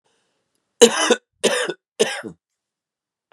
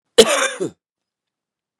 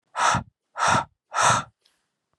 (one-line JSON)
{"three_cough_length": "3.3 s", "three_cough_amplitude": 32768, "three_cough_signal_mean_std_ratio": 0.32, "cough_length": "1.8 s", "cough_amplitude": 32768, "cough_signal_mean_std_ratio": 0.31, "exhalation_length": "2.4 s", "exhalation_amplitude": 15871, "exhalation_signal_mean_std_ratio": 0.48, "survey_phase": "beta (2021-08-13 to 2022-03-07)", "age": "18-44", "gender": "Male", "wearing_mask": "No", "symptom_cough_any": true, "symptom_runny_or_blocked_nose": true, "symptom_sore_throat": true, "symptom_fatigue": true, "symptom_headache": true, "symptom_onset": "1 day", "smoker_status": "Ex-smoker", "respiratory_condition_asthma": false, "respiratory_condition_other": false, "recruitment_source": "Test and Trace", "submission_delay": "1 day", "covid_test_result": "Positive", "covid_test_method": "RT-qPCR", "covid_ct_value": 21.5, "covid_ct_gene": "ORF1ab gene", "covid_ct_mean": 21.9, "covid_viral_load": "64000 copies/ml", "covid_viral_load_category": "Low viral load (10K-1M copies/ml)"}